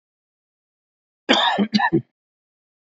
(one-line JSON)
{"cough_length": "3.0 s", "cough_amplitude": 27414, "cough_signal_mean_std_ratio": 0.36, "survey_phase": "beta (2021-08-13 to 2022-03-07)", "age": "45-64", "gender": "Male", "wearing_mask": "No", "symptom_cough_any": true, "symptom_runny_or_blocked_nose": true, "symptom_headache": true, "symptom_onset": "12 days", "smoker_status": "Ex-smoker", "respiratory_condition_asthma": true, "respiratory_condition_other": false, "recruitment_source": "REACT", "submission_delay": "1 day", "covid_test_result": "Negative", "covid_test_method": "RT-qPCR", "influenza_a_test_result": "Negative", "influenza_b_test_result": "Negative"}